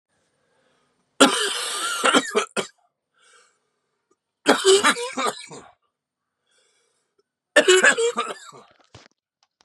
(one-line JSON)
{"three_cough_length": "9.6 s", "three_cough_amplitude": 32603, "three_cough_signal_mean_std_ratio": 0.37, "survey_phase": "beta (2021-08-13 to 2022-03-07)", "age": "18-44", "gender": "Male", "wearing_mask": "No", "symptom_cough_any": true, "symptom_fatigue": true, "symptom_headache": true, "symptom_other": true, "symptom_onset": "2 days", "smoker_status": "Never smoked", "respiratory_condition_asthma": false, "respiratory_condition_other": false, "recruitment_source": "Test and Trace", "submission_delay": "1 day", "covid_test_result": "Positive", "covid_test_method": "RT-qPCR", "covid_ct_value": 23.0, "covid_ct_gene": "ORF1ab gene"}